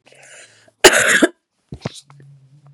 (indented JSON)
{
  "cough_length": "2.7 s",
  "cough_amplitude": 32768,
  "cough_signal_mean_std_ratio": 0.32,
  "survey_phase": "beta (2021-08-13 to 2022-03-07)",
  "age": "45-64",
  "gender": "Female",
  "wearing_mask": "No",
  "symptom_cough_any": true,
  "symptom_runny_or_blocked_nose": true,
  "symptom_sore_throat": true,
  "symptom_fatigue": true,
  "symptom_onset": "4 days",
  "smoker_status": "Never smoked",
  "respiratory_condition_asthma": false,
  "respiratory_condition_other": false,
  "recruitment_source": "Test and Trace",
  "submission_delay": "2 days",
  "covid_test_result": "Positive",
  "covid_test_method": "RT-qPCR",
  "covid_ct_value": 14.9,
  "covid_ct_gene": "ORF1ab gene"
}